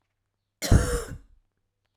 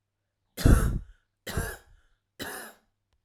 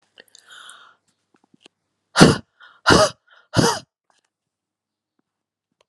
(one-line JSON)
{"cough_length": "2.0 s", "cough_amplitude": 17961, "cough_signal_mean_std_ratio": 0.31, "three_cough_length": "3.2 s", "three_cough_amplitude": 19353, "three_cough_signal_mean_std_ratio": 0.31, "exhalation_length": "5.9 s", "exhalation_amplitude": 32768, "exhalation_signal_mean_std_ratio": 0.25, "survey_phase": "alpha (2021-03-01 to 2021-08-12)", "age": "18-44", "gender": "Female", "wearing_mask": "No", "symptom_none": true, "smoker_status": "Never smoked", "respiratory_condition_asthma": false, "respiratory_condition_other": false, "recruitment_source": "REACT", "submission_delay": "1 day", "covid_test_result": "Negative", "covid_test_method": "RT-qPCR"}